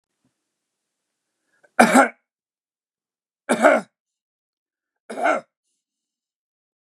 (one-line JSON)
{"three_cough_length": "6.9 s", "three_cough_amplitude": 32586, "three_cough_signal_mean_std_ratio": 0.25, "survey_phase": "beta (2021-08-13 to 2022-03-07)", "age": "65+", "gender": "Male", "wearing_mask": "No", "symptom_none": true, "symptom_onset": "12 days", "smoker_status": "Never smoked", "respiratory_condition_asthma": false, "respiratory_condition_other": false, "recruitment_source": "REACT", "submission_delay": "2 days", "covid_test_result": "Negative", "covid_test_method": "RT-qPCR", "influenza_a_test_result": "Negative", "influenza_b_test_result": "Negative"}